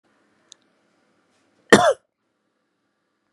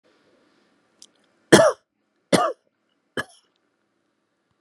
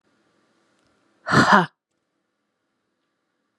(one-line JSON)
{"cough_length": "3.3 s", "cough_amplitude": 32768, "cough_signal_mean_std_ratio": 0.18, "three_cough_length": "4.6 s", "three_cough_amplitude": 32767, "three_cough_signal_mean_std_ratio": 0.22, "exhalation_length": "3.6 s", "exhalation_amplitude": 32551, "exhalation_signal_mean_std_ratio": 0.24, "survey_phase": "beta (2021-08-13 to 2022-03-07)", "age": "45-64", "gender": "Female", "wearing_mask": "No", "symptom_none": true, "smoker_status": "Never smoked", "respiratory_condition_asthma": false, "respiratory_condition_other": false, "recruitment_source": "REACT", "submission_delay": "1 day", "covid_test_result": "Negative", "covid_test_method": "RT-qPCR", "influenza_a_test_result": "Negative", "influenza_b_test_result": "Negative"}